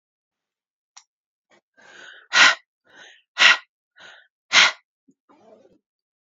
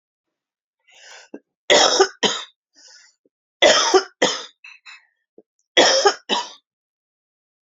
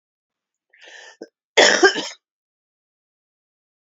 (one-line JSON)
{"exhalation_length": "6.2 s", "exhalation_amplitude": 30245, "exhalation_signal_mean_std_ratio": 0.24, "three_cough_length": "7.8 s", "three_cough_amplitude": 29690, "three_cough_signal_mean_std_ratio": 0.36, "cough_length": "3.9 s", "cough_amplitude": 28895, "cough_signal_mean_std_ratio": 0.25, "survey_phase": "beta (2021-08-13 to 2022-03-07)", "age": "45-64", "gender": "Female", "wearing_mask": "No", "symptom_cough_any": true, "symptom_new_continuous_cough": true, "symptom_runny_or_blocked_nose": true, "symptom_sore_throat": true, "smoker_status": "Ex-smoker", "respiratory_condition_asthma": false, "respiratory_condition_other": false, "recruitment_source": "Test and Trace", "submission_delay": "1 day", "covid_test_result": "Positive", "covid_test_method": "LFT"}